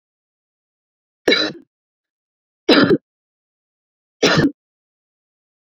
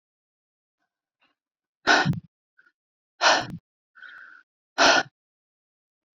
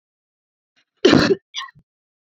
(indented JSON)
{
  "three_cough_length": "5.7 s",
  "three_cough_amplitude": 29900,
  "three_cough_signal_mean_std_ratio": 0.29,
  "exhalation_length": "6.1 s",
  "exhalation_amplitude": 19274,
  "exhalation_signal_mean_std_ratio": 0.28,
  "cough_length": "2.3 s",
  "cough_amplitude": 27451,
  "cough_signal_mean_std_ratio": 0.3,
  "survey_phase": "beta (2021-08-13 to 2022-03-07)",
  "age": "18-44",
  "gender": "Female",
  "wearing_mask": "No",
  "symptom_none": true,
  "smoker_status": "Never smoked",
  "respiratory_condition_asthma": false,
  "respiratory_condition_other": false,
  "recruitment_source": "REACT",
  "submission_delay": "1 day",
  "covid_test_result": "Negative",
  "covid_test_method": "RT-qPCR"
}